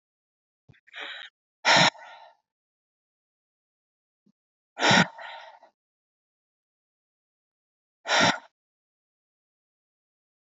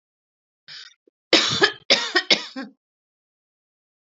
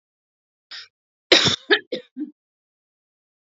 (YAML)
exhalation_length: 10.4 s
exhalation_amplitude: 16352
exhalation_signal_mean_std_ratio: 0.24
three_cough_length: 4.1 s
three_cough_amplitude: 30522
three_cough_signal_mean_std_ratio: 0.32
cough_length: 3.6 s
cough_amplitude: 32767
cough_signal_mean_std_ratio: 0.25
survey_phase: alpha (2021-03-01 to 2021-08-12)
age: 45-64
gender: Female
wearing_mask: 'No'
symptom_cough_any: true
symptom_abdominal_pain: true
symptom_fatigue: true
symptom_headache: true
smoker_status: Ex-smoker
respiratory_condition_asthma: false
respiratory_condition_other: false
recruitment_source: Test and Trace
submission_delay: 2 days
covid_test_result: Positive
covid_test_method: RT-qPCR
covid_ct_value: 19.6
covid_ct_gene: ORF1ab gene
covid_ct_mean: 20.7
covid_viral_load: 160000 copies/ml
covid_viral_load_category: Low viral load (10K-1M copies/ml)